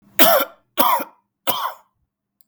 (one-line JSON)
{"three_cough_length": "2.5 s", "three_cough_amplitude": 32768, "three_cough_signal_mean_std_ratio": 0.42, "survey_phase": "beta (2021-08-13 to 2022-03-07)", "age": "45-64", "gender": "Male", "wearing_mask": "No", "symptom_none": true, "smoker_status": "Never smoked", "respiratory_condition_asthma": false, "respiratory_condition_other": false, "recruitment_source": "Test and Trace", "submission_delay": "0 days", "covid_test_result": "Negative", "covid_test_method": "LFT"}